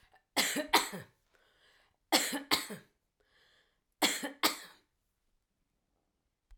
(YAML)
three_cough_length: 6.6 s
three_cough_amplitude: 11555
three_cough_signal_mean_std_ratio: 0.32
survey_phase: alpha (2021-03-01 to 2021-08-12)
age: 65+
gender: Female
wearing_mask: 'No'
symptom_none: true
smoker_status: Never smoked
respiratory_condition_asthma: false
respiratory_condition_other: false
recruitment_source: REACT
submission_delay: 1 day
covid_test_result: Negative
covid_test_method: RT-qPCR